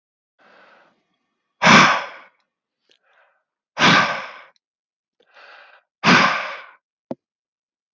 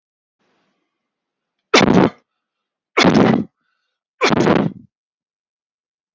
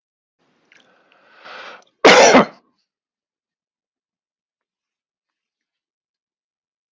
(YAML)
exhalation_length: 7.9 s
exhalation_amplitude: 32559
exhalation_signal_mean_std_ratio: 0.31
three_cough_length: 6.1 s
three_cough_amplitude: 32667
three_cough_signal_mean_std_ratio: 0.36
cough_length: 6.9 s
cough_amplitude: 32768
cough_signal_mean_std_ratio: 0.21
survey_phase: beta (2021-08-13 to 2022-03-07)
age: 45-64
gender: Male
wearing_mask: 'No'
symptom_none: true
smoker_status: Ex-smoker
respiratory_condition_asthma: false
respiratory_condition_other: false
recruitment_source: REACT
submission_delay: 3 days
covid_test_result: Negative
covid_test_method: RT-qPCR